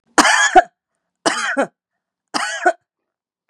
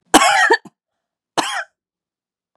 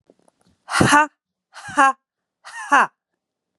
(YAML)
three_cough_length: 3.5 s
three_cough_amplitude: 32768
three_cough_signal_mean_std_ratio: 0.4
cough_length: 2.6 s
cough_amplitude: 32768
cough_signal_mean_std_ratio: 0.38
exhalation_length: 3.6 s
exhalation_amplitude: 31398
exhalation_signal_mean_std_ratio: 0.34
survey_phase: beta (2021-08-13 to 2022-03-07)
age: 18-44
gender: Female
wearing_mask: 'No'
symptom_runny_or_blocked_nose: true
smoker_status: Never smoked
respiratory_condition_asthma: true
respiratory_condition_other: false
recruitment_source: Test and Trace
submission_delay: 1 day
covid_test_result: Negative
covid_test_method: RT-qPCR